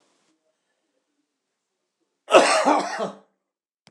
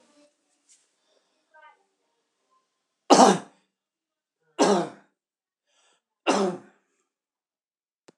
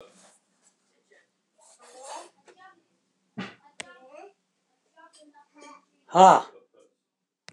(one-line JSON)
{"cough_length": "3.9 s", "cough_amplitude": 26027, "cough_signal_mean_std_ratio": 0.31, "three_cough_length": "8.2 s", "three_cough_amplitude": 25473, "three_cough_signal_mean_std_ratio": 0.23, "exhalation_length": "7.5 s", "exhalation_amplitude": 24772, "exhalation_signal_mean_std_ratio": 0.17, "survey_phase": "beta (2021-08-13 to 2022-03-07)", "age": "65+", "gender": "Male", "wearing_mask": "No", "symptom_cough_any": true, "smoker_status": "Ex-smoker", "respiratory_condition_asthma": false, "respiratory_condition_other": false, "recruitment_source": "REACT", "submission_delay": "2 days", "covid_test_result": "Negative", "covid_test_method": "RT-qPCR", "influenza_a_test_result": "Negative", "influenza_b_test_result": "Negative"}